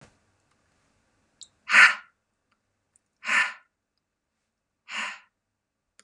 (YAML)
exhalation_length: 6.0 s
exhalation_amplitude: 22735
exhalation_signal_mean_std_ratio: 0.22
survey_phase: beta (2021-08-13 to 2022-03-07)
age: 65+
gender: Female
wearing_mask: 'No'
symptom_cough_any: true
symptom_runny_or_blocked_nose: true
symptom_change_to_sense_of_smell_or_taste: true
symptom_onset: 6 days
smoker_status: Never smoked
respiratory_condition_asthma: false
respiratory_condition_other: false
recruitment_source: REACT
submission_delay: 2 days
covid_test_result: Negative
covid_test_method: RT-qPCR
influenza_a_test_result: Negative
influenza_b_test_result: Negative